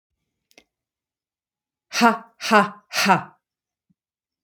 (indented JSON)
{
  "exhalation_length": "4.4 s",
  "exhalation_amplitude": 27664,
  "exhalation_signal_mean_std_ratio": 0.3,
  "survey_phase": "alpha (2021-03-01 to 2021-08-12)",
  "age": "18-44",
  "gender": "Female",
  "wearing_mask": "No",
  "symptom_none": true,
  "smoker_status": "Never smoked",
  "respiratory_condition_asthma": false,
  "respiratory_condition_other": false,
  "recruitment_source": "REACT",
  "submission_delay": "3 days",
  "covid_test_result": "Negative",
  "covid_test_method": "RT-qPCR"
}